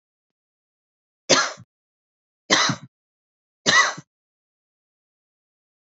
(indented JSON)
{
  "three_cough_length": "5.8 s",
  "three_cough_amplitude": 28000,
  "three_cough_signal_mean_std_ratio": 0.27,
  "survey_phase": "beta (2021-08-13 to 2022-03-07)",
  "age": "18-44",
  "gender": "Female",
  "wearing_mask": "No",
  "symptom_cough_any": true,
  "symptom_runny_or_blocked_nose": true,
  "symptom_sore_throat": true,
  "symptom_fatigue": true,
  "symptom_onset": "2 days",
  "smoker_status": "Never smoked",
  "respiratory_condition_asthma": false,
  "respiratory_condition_other": false,
  "recruitment_source": "Test and Trace",
  "submission_delay": "1 day",
  "covid_test_result": "Positive",
  "covid_test_method": "RT-qPCR",
  "covid_ct_value": 24.3,
  "covid_ct_gene": "ORF1ab gene",
  "covid_ct_mean": 24.7,
  "covid_viral_load": "8100 copies/ml",
  "covid_viral_load_category": "Minimal viral load (< 10K copies/ml)"
}